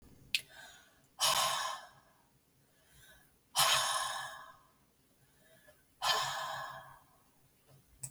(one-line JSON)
{"exhalation_length": "8.1 s", "exhalation_amplitude": 8623, "exhalation_signal_mean_std_ratio": 0.43, "survey_phase": "beta (2021-08-13 to 2022-03-07)", "age": "45-64", "gender": "Female", "wearing_mask": "No", "symptom_cough_any": true, "symptom_runny_or_blocked_nose": true, "smoker_status": "Ex-smoker", "respiratory_condition_asthma": false, "respiratory_condition_other": false, "recruitment_source": "REACT", "submission_delay": "1 day", "covid_test_result": "Negative", "covid_test_method": "RT-qPCR"}